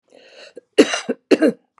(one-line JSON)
{"cough_length": "1.8 s", "cough_amplitude": 32768, "cough_signal_mean_std_ratio": 0.35, "survey_phase": "beta (2021-08-13 to 2022-03-07)", "age": "65+", "gender": "Female", "wearing_mask": "No", "symptom_none": true, "smoker_status": "Never smoked", "respiratory_condition_asthma": false, "respiratory_condition_other": false, "recruitment_source": "REACT", "submission_delay": "30 days", "covid_test_result": "Negative", "covid_test_method": "RT-qPCR"}